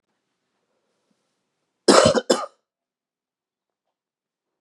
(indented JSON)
{
  "cough_length": "4.6 s",
  "cough_amplitude": 31545,
  "cough_signal_mean_std_ratio": 0.23,
  "survey_phase": "beta (2021-08-13 to 2022-03-07)",
  "age": "45-64",
  "gender": "Male",
  "wearing_mask": "No",
  "symptom_cough_any": true,
  "symptom_sore_throat": true,
  "symptom_diarrhoea": true,
  "symptom_fatigue": true,
  "symptom_change_to_sense_of_smell_or_taste": true,
  "symptom_loss_of_taste": true,
  "symptom_onset": "4 days",
  "smoker_status": "Ex-smoker",
  "respiratory_condition_asthma": false,
  "respiratory_condition_other": false,
  "recruitment_source": "Test and Trace",
  "submission_delay": "2 days",
  "covid_test_result": "Positive",
  "covid_test_method": "RT-qPCR",
  "covid_ct_value": 36.0,
  "covid_ct_gene": "N gene"
}